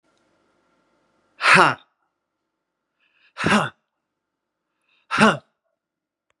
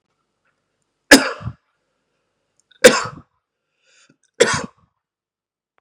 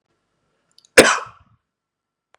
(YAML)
exhalation_length: 6.4 s
exhalation_amplitude: 32506
exhalation_signal_mean_std_ratio: 0.26
three_cough_length: 5.8 s
three_cough_amplitude: 32768
three_cough_signal_mean_std_ratio: 0.21
cough_length: 2.4 s
cough_amplitude: 32768
cough_signal_mean_std_ratio: 0.21
survey_phase: beta (2021-08-13 to 2022-03-07)
age: 45-64
gender: Male
wearing_mask: 'No'
symptom_none: true
smoker_status: Ex-smoker
respiratory_condition_asthma: false
respiratory_condition_other: false
recruitment_source: REACT
submission_delay: 2 days
covid_test_result: Negative
covid_test_method: RT-qPCR
influenza_a_test_result: Negative
influenza_b_test_result: Negative